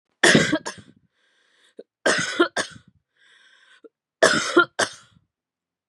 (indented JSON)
{
  "three_cough_length": "5.9 s",
  "three_cough_amplitude": 31472,
  "three_cough_signal_mean_std_ratio": 0.35,
  "survey_phase": "beta (2021-08-13 to 2022-03-07)",
  "age": "18-44",
  "gender": "Female",
  "wearing_mask": "No",
  "symptom_cough_any": true,
  "symptom_runny_or_blocked_nose": true,
  "symptom_shortness_of_breath": true,
  "symptom_sore_throat": true,
  "symptom_headache": true,
  "smoker_status": "Never smoked",
  "respiratory_condition_asthma": false,
  "respiratory_condition_other": false,
  "recruitment_source": "Test and Trace",
  "submission_delay": "2 days",
  "covid_test_result": "Positive",
  "covid_test_method": "LFT"
}